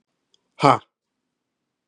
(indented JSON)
{
  "exhalation_length": "1.9 s",
  "exhalation_amplitude": 32767,
  "exhalation_signal_mean_std_ratio": 0.18,
  "survey_phase": "beta (2021-08-13 to 2022-03-07)",
  "age": "45-64",
  "gender": "Male",
  "wearing_mask": "No",
  "symptom_cough_any": true,
  "symptom_runny_or_blocked_nose": true,
  "symptom_abdominal_pain": true,
  "symptom_fatigue": true,
  "symptom_onset": "4 days",
  "smoker_status": "Ex-smoker",
  "respiratory_condition_asthma": false,
  "respiratory_condition_other": false,
  "recruitment_source": "Test and Trace",
  "submission_delay": "2 days",
  "covid_test_result": "Positive",
  "covid_test_method": "RT-qPCR",
  "covid_ct_value": 18.0,
  "covid_ct_gene": "ORF1ab gene",
  "covid_ct_mean": 18.4,
  "covid_viral_load": "920000 copies/ml",
  "covid_viral_load_category": "Low viral load (10K-1M copies/ml)"
}